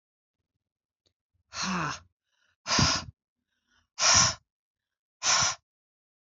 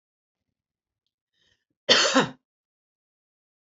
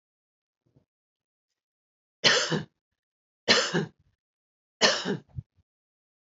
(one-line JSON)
{"exhalation_length": "6.4 s", "exhalation_amplitude": 15167, "exhalation_signal_mean_std_ratio": 0.36, "cough_length": "3.8 s", "cough_amplitude": 23521, "cough_signal_mean_std_ratio": 0.24, "three_cough_length": "6.4 s", "three_cough_amplitude": 16162, "three_cough_signal_mean_std_ratio": 0.3, "survey_phase": "beta (2021-08-13 to 2022-03-07)", "age": "45-64", "gender": "Female", "wearing_mask": "No", "symptom_sore_throat": true, "symptom_headache": true, "smoker_status": "Current smoker (1 to 10 cigarettes per day)", "respiratory_condition_asthma": false, "respiratory_condition_other": false, "recruitment_source": "Test and Trace", "submission_delay": "2 days", "covid_test_result": "Positive", "covid_test_method": "RT-qPCR", "covid_ct_value": 26.0, "covid_ct_gene": "ORF1ab gene"}